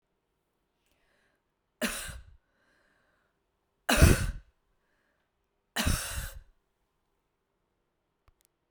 three_cough_length: 8.7 s
three_cough_amplitude: 14719
three_cough_signal_mean_std_ratio: 0.24
survey_phase: beta (2021-08-13 to 2022-03-07)
age: 65+
gender: Female
wearing_mask: 'No'
symptom_none: true
smoker_status: Never smoked
respiratory_condition_asthma: false
respiratory_condition_other: false
recruitment_source: REACT
submission_delay: 3 days
covid_test_result: Negative
covid_test_method: RT-qPCR
influenza_a_test_result: Negative
influenza_b_test_result: Negative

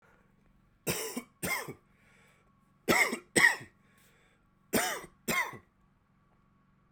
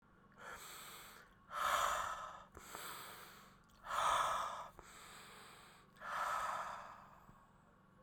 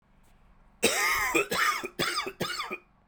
three_cough_length: 6.9 s
three_cough_amplitude: 11591
three_cough_signal_mean_std_ratio: 0.35
exhalation_length: 8.0 s
exhalation_amplitude: 2090
exhalation_signal_mean_std_ratio: 0.57
cough_length: 3.1 s
cough_amplitude: 11457
cough_signal_mean_std_ratio: 0.64
survey_phase: beta (2021-08-13 to 2022-03-07)
age: 18-44
gender: Male
wearing_mask: 'No'
symptom_cough_any: true
symptom_new_continuous_cough: true
symptom_runny_or_blocked_nose: true
symptom_abdominal_pain: true
symptom_fatigue: true
symptom_change_to_sense_of_smell_or_taste: true
symptom_loss_of_taste: true
symptom_onset: 2 days
smoker_status: Never smoked
respiratory_condition_asthma: false
respiratory_condition_other: true
recruitment_source: Test and Trace
submission_delay: 1 day
covid_test_result: Positive
covid_test_method: ePCR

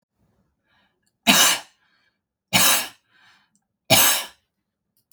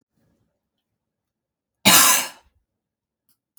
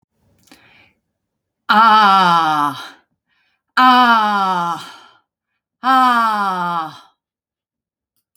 three_cough_length: 5.1 s
three_cough_amplitude: 32767
three_cough_signal_mean_std_ratio: 0.34
cough_length: 3.6 s
cough_amplitude: 32476
cough_signal_mean_std_ratio: 0.26
exhalation_length: 8.4 s
exhalation_amplitude: 30387
exhalation_signal_mean_std_ratio: 0.51
survey_phase: beta (2021-08-13 to 2022-03-07)
age: 45-64
gender: Female
wearing_mask: 'No'
symptom_none: true
smoker_status: Never smoked
respiratory_condition_asthma: false
respiratory_condition_other: false
recruitment_source: REACT
submission_delay: 1 day
covid_test_result: Negative
covid_test_method: RT-qPCR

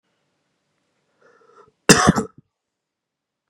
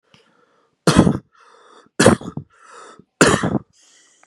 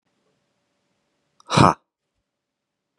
cough_length: 3.5 s
cough_amplitude: 32768
cough_signal_mean_std_ratio: 0.21
three_cough_length: 4.3 s
three_cough_amplitude: 32768
three_cough_signal_mean_std_ratio: 0.34
exhalation_length: 3.0 s
exhalation_amplitude: 31564
exhalation_signal_mean_std_ratio: 0.18
survey_phase: beta (2021-08-13 to 2022-03-07)
age: 18-44
gender: Male
wearing_mask: 'No'
symptom_sore_throat: true
smoker_status: Current smoker (1 to 10 cigarettes per day)
respiratory_condition_asthma: false
respiratory_condition_other: false
recruitment_source: REACT
submission_delay: 3 days
covid_test_result: Negative
covid_test_method: RT-qPCR
influenza_a_test_result: Negative
influenza_b_test_result: Negative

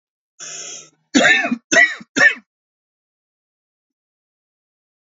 cough_length: 5.0 s
cough_amplitude: 30529
cough_signal_mean_std_ratio: 0.32
survey_phase: alpha (2021-03-01 to 2021-08-12)
age: 45-64
gender: Male
wearing_mask: 'No'
symptom_none: true
smoker_status: Never smoked
respiratory_condition_asthma: false
respiratory_condition_other: false
recruitment_source: REACT
submission_delay: 0 days
covid_test_result: Negative
covid_test_method: RT-qPCR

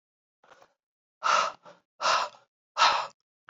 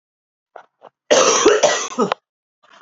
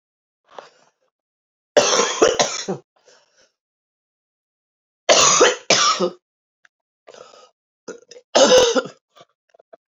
exhalation_length: 3.5 s
exhalation_amplitude: 14613
exhalation_signal_mean_std_ratio: 0.39
cough_length: 2.8 s
cough_amplitude: 32767
cough_signal_mean_std_ratio: 0.46
three_cough_length: 10.0 s
three_cough_amplitude: 32768
three_cough_signal_mean_std_ratio: 0.37
survey_phase: alpha (2021-03-01 to 2021-08-12)
age: 45-64
gender: Female
wearing_mask: 'No'
symptom_cough_any: true
symptom_shortness_of_breath: true
symptom_fatigue: true
symptom_fever_high_temperature: true
symptom_headache: true
symptom_onset: 3 days
smoker_status: Ex-smoker
respiratory_condition_asthma: true
respiratory_condition_other: false
recruitment_source: Test and Trace
submission_delay: 2 days
covid_test_result: Positive
covid_test_method: RT-qPCR
covid_ct_value: 21.2
covid_ct_gene: ORF1ab gene
covid_ct_mean: 22.1
covid_viral_load: 55000 copies/ml
covid_viral_load_category: Low viral load (10K-1M copies/ml)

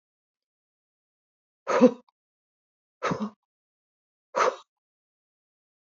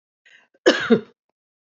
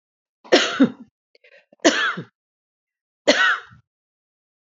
exhalation_length: 6.0 s
exhalation_amplitude: 18140
exhalation_signal_mean_std_ratio: 0.22
cough_length: 1.7 s
cough_amplitude: 26225
cough_signal_mean_std_ratio: 0.29
three_cough_length: 4.7 s
three_cough_amplitude: 29674
three_cough_signal_mean_std_ratio: 0.34
survey_phase: beta (2021-08-13 to 2022-03-07)
age: 65+
gender: Female
wearing_mask: 'No'
symptom_headache: true
smoker_status: Ex-smoker
respiratory_condition_asthma: true
respiratory_condition_other: false
recruitment_source: REACT
submission_delay: 1 day
covid_test_result: Negative
covid_test_method: RT-qPCR
influenza_a_test_result: Unknown/Void
influenza_b_test_result: Unknown/Void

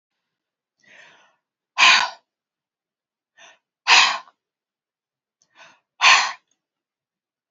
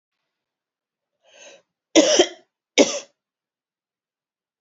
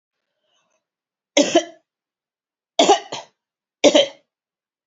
exhalation_length: 7.5 s
exhalation_amplitude: 30401
exhalation_signal_mean_std_ratio: 0.26
cough_length: 4.6 s
cough_amplitude: 29565
cough_signal_mean_std_ratio: 0.24
three_cough_length: 4.9 s
three_cough_amplitude: 31619
three_cough_signal_mean_std_ratio: 0.28
survey_phase: beta (2021-08-13 to 2022-03-07)
age: 45-64
gender: Female
wearing_mask: 'No'
symptom_runny_or_blocked_nose: true
smoker_status: Never smoked
respiratory_condition_asthma: false
respiratory_condition_other: false
recruitment_source: Test and Trace
submission_delay: 2 days
covid_test_result: Positive
covid_test_method: LFT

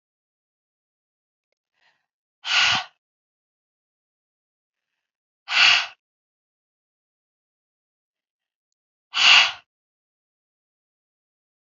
exhalation_length: 11.6 s
exhalation_amplitude: 26747
exhalation_signal_mean_std_ratio: 0.22
survey_phase: alpha (2021-03-01 to 2021-08-12)
age: 45-64
gender: Female
wearing_mask: 'No'
symptom_cough_any: true
symptom_shortness_of_breath: true
symptom_fatigue: true
symptom_headache: true
symptom_onset: 3 days
smoker_status: Ex-smoker
respiratory_condition_asthma: true
respiratory_condition_other: false
recruitment_source: Test and Trace
submission_delay: 1 day
covid_test_result: Positive
covid_test_method: RT-qPCR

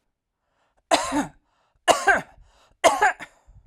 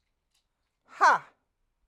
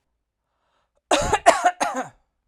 three_cough_length: 3.7 s
three_cough_amplitude: 31896
three_cough_signal_mean_std_ratio: 0.37
exhalation_length: 1.9 s
exhalation_amplitude: 12743
exhalation_signal_mean_std_ratio: 0.25
cough_length: 2.5 s
cough_amplitude: 32767
cough_signal_mean_std_ratio: 0.38
survey_phase: alpha (2021-03-01 to 2021-08-12)
age: 45-64
gender: Female
wearing_mask: 'No'
symptom_none: true
smoker_status: Never smoked
respiratory_condition_asthma: false
respiratory_condition_other: false
recruitment_source: REACT
submission_delay: 2 days
covid_test_result: Negative
covid_test_method: RT-qPCR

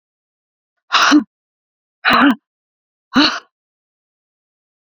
exhalation_length: 4.9 s
exhalation_amplitude: 29805
exhalation_signal_mean_std_ratio: 0.34
survey_phase: beta (2021-08-13 to 2022-03-07)
age: 45-64
gender: Female
wearing_mask: 'No'
symptom_none: true
smoker_status: Never smoked
respiratory_condition_asthma: false
respiratory_condition_other: false
recruitment_source: REACT
submission_delay: 1 day
covid_test_result: Negative
covid_test_method: RT-qPCR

